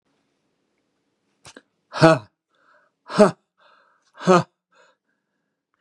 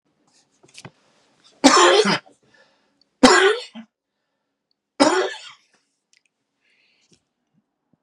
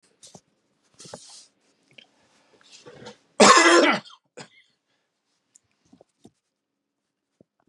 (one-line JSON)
{"exhalation_length": "5.8 s", "exhalation_amplitude": 32767, "exhalation_signal_mean_std_ratio": 0.22, "three_cough_length": "8.0 s", "three_cough_amplitude": 32767, "three_cough_signal_mean_std_ratio": 0.3, "cough_length": "7.7 s", "cough_amplitude": 31585, "cough_signal_mean_std_ratio": 0.23, "survey_phase": "beta (2021-08-13 to 2022-03-07)", "age": "65+", "gender": "Male", "wearing_mask": "No", "symptom_none": true, "smoker_status": "Ex-smoker", "respiratory_condition_asthma": false, "respiratory_condition_other": false, "recruitment_source": "REACT", "submission_delay": "1 day", "covid_test_result": "Negative", "covid_test_method": "RT-qPCR", "influenza_a_test_result": "Negative", "influenza_b_test_result": "Negative"}